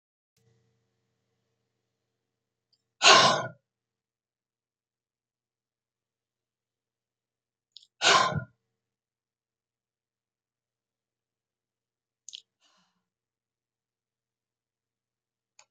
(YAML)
exhalation_length: 15.7 s
exhalation_amplitude: 23014
exhalation_signal_mean_std_ratio: 0.16
survey_phase: beta (2021-08-13 to 2022-03-07)
age: 65+
gender: Female
wearing_mask: 'No'
symptom_none: true
smoker_status: Never smoked
respiratory_condition_asthma: false
respiratory_condition_other: false
recruitment_source: REACT
submission_delay: 2 days
covid_test_result: Negative
covid_test_method: RT-qPCR
influenza_a_test_result: Negative
influenza_b_test_result: Negative